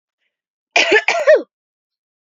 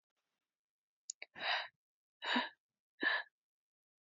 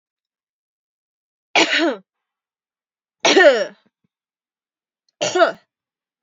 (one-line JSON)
{"cough_length": "2.4 s", "cough_amplitude": 31444, "cough_signal_mean_std_ratio": 0.38, "exhalation_length": "4.0 s", "exhalation_amplitude": 3286, "exhalation_signal_mean_std_ratio": 0.34, "three_cough_length": "6.2 s", "three_cough_amplitude": 30150, "three_cough_signal_mean_std_ratio": 0.31, "survey_phase": "beta (2021-08-13 to 2022-03-07)", "age": "18-44", "gender": "Female", "wearing_mask": "No", "symptom_cough_any": true, "symptom_runny_or_blocked_nose": true, "symptom_sore_throat": true, "symptom_abdominal_pain": true, "symptom_fatigue": true, "symptom_fever_high_temperature": true, "symptom_headache": true, "symptom_onset": "2 days", "smoker_status": "Never smoked", "respiratory_condition_asthma": false, "respiratory_condition_other": false, "recruitment_source": "Test and Trace", "submission_delay": "2 days", "covid_test_result": "Positive", "covid_test_method": "RT-qPCR", "covid_ct_value": 21.3, "covid_ct_gene": "N gene"}